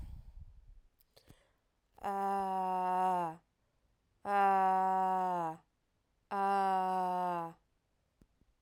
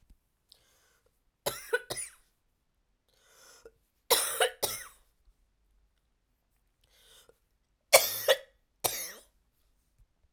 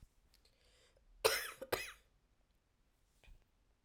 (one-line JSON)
{"exhalation_length": "8.6 s", "exhalation_amplitude": 3611, "exhalation_signal_mean_std_ratio": 0.63, "three_cough_length": "10.3 s", "three_cough_amplitude": 18904, "three_cough_signal_mean_std_ratio": 0.24, "cough_length": "3.8 s", "cough_amplitude": 4862, "cough_signal_mean_std_ratio": 0.26, "survey_phase": "beta (2021-08-13 to 2022-03-07)", "age": "18-44", "gender": "Female", "wearing_mask": "No", "symptom_cough_any": true, "symptom_runny_or_blocked_nose": true, "symptom_diarrhoea": true, "symptom_fatigue": true, "symptom_fever_high_temperature": true, "symptom_headache": true, "symptom_change_to_sense_of_smell_or_taste": true, "symptom_loss_of_taste": true, "symptom_onset": "6 days", "smoker_status": "Never smoked", "respiratory_condition_asthma": false, "respiratory_condition_other": false, "recruitment_source": "Test and Trace", "submission_delay": "1 day", "covid_test_result": "Positive", "covid_test_method": "RT-qPCR"}